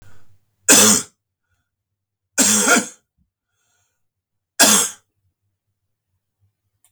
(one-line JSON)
{"three_cough_length": "6.9 s", "three_cough_amplitude": 32768, "three_cough_signal_mean_std_ratio": 0.32, "survey_phase": "beta (2021-08-13 to 2022-03-07)", "age": "45-64", "gender": "Male", "wearing_mask": "No", "symptom_cough_any": true, "symptom_runny_or_blocked_nose": true, "symptom_onset": "4 days", "smoker_status": "Never smoked", "respiratory_condition_asthma": false, "respiratory_condition_other": false, "recruitment_source": "Test and Trace", "submission_delay": "3 days", "covid_test_result": "Positive", "covid_test_method": "RT-qPCR", "covid_ct_value": 34.1, "covid_ct_gene": "N gene"}